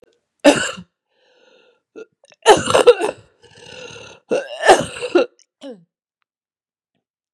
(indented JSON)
{
  "three_cough_length": "7.3 s",
  "three_cough_amplitude": 32768,
  "three_cough_signal_mean_std_ratio": 0.31,
  "survey_phase": "beta (2021-08-13 to 2022-03-07)",
  "age": "45-64",
  "gender": "Female",
  "wearing_mask": "No",
  "symptom_cough_any": true,
  "symptom_runny_or_blocked_nose": true,
  "symptom_fatigue": true,
  "symptom_change_to_sense_of_smell_or_taste": true,
  "symptom_loss_of_taste": true,
  "symptom_onset": "2 days",
  "smoker_status": "Never smoked",
  "respiratory_condition_asthma": false,
  "respiratory_condition_other": false,
  "recruitment_source": "Test and Trace",
  "submission_delay": "1 day",
  "covid_test_result": "Positive",
  "covid_test_method": "RT-qPCR"
}